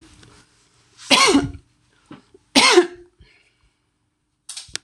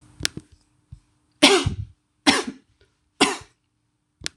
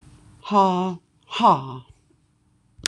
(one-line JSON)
{"cough_length": "4.8 s", "cough_amplitude": 26028, "cough_signal_mean_std_ratio": 0.32, "three_cough_length": "4.4 s", "three_cough_amplitude": 26028, "three_cough_signal_mean_std_ratio": 0.3, "exhalation_length": "2.9 s", "exhalation_amplitude": 26028, "exhalation_signal_mean_std_ratio": 0.41, "survey_phase": "beta (2021-08-13 to 2022-03-07)", "age": "65+", "gender": "Female", "wearing_mask": "No", "symptom_none": true, "smoker_status": "Ex-smoker", "respiratory_condition_asthma": false, "respiratory_condition_other": false, "recruitment_source": "REACT", "submission_delay": "3 days", "covid_test_result": "Negative", "covid_test_method": "RT-qPCR", "influenza_a_test_result": "Negative", "influenza_b_test_result": "Negative"}